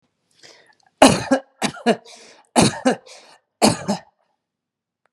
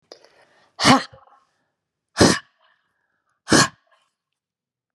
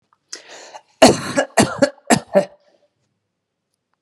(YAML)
three_cough_length: 5.1 s
three_cough_amplitude: 32768
three_cough_signal_mean_std_ratio: 0.33
exhalation_length: 4.9 s
exhalation_amplitude: 32502
exhalation_signal_mean_std_ratio: 0.26
cough_length: 4.0 s
cough_amplitude: 32768
cough_signal_mean_std_ratio: 0.32
survey_phase: beta (2021-08-13 to 2022-03-07)
age: 45-64
gender: Female
wearing_mask: 'No'
symptom_none: true
smoker_status: Never smoked
respiratory_condition_asthma: false
respiratory_condition_other: false
recruitment_source: REACT
submission_delay: 1 day
covid_test_result: Negative
covid_test_method: RT-qPCR